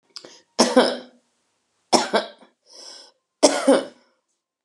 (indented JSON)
{
  "three_cough_length": "4.6 s",
  "three_cough_amplitude": 31882,
  "three_cough_signal_mean_std_ratio": 0.34,
  "survey_phase": "beta (2021-08-13 to 2022-03-07)",
  "age": "65+",
  "gender": "Female",
  "wearing_mask": "Yes",
  "symptom_headache": true,
  "smoker_status": "Ex-smoker",
  "respiratory_condition_asthma": false,
  "respiratory_condition_other": false,
  "recruitment_source": "REACT",
  "submission_delay": "19 days",
  "covid_test_result": "Negative",
  "covid_test_method": "RT-qPCR",
  "influenza_a_test_result": "Negative",
  "influenza_b_test_result": "Negative"
}